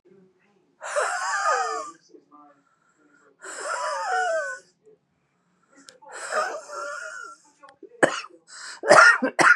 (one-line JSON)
{"exhalation_length": "9.6 s", "exhalation_amplitude": 31396, "exhalation_signal_mean_std_ratio": 0.4, "survey_phase": "beta (2021-08-13 to 2022-03-07)", "age": "45-64", "gender": "Female", "wearing_mask": "No", "symptom_runny_or_blocked_nose": true, "symptom_fatigue": true, "symptom_headache": true, "smoker_status": "Ex-smoker", "respiratory_condition_asthma": false, "respiratory_condition_other": false, "recruitment_source": "REACT", "submission_delay": "1 day", "covid_test_result": "Negative", "covid_test_method": "RT-qPCR", "influenza_a_test_result": "Negative", "influenza_b_test_result": "Negative"}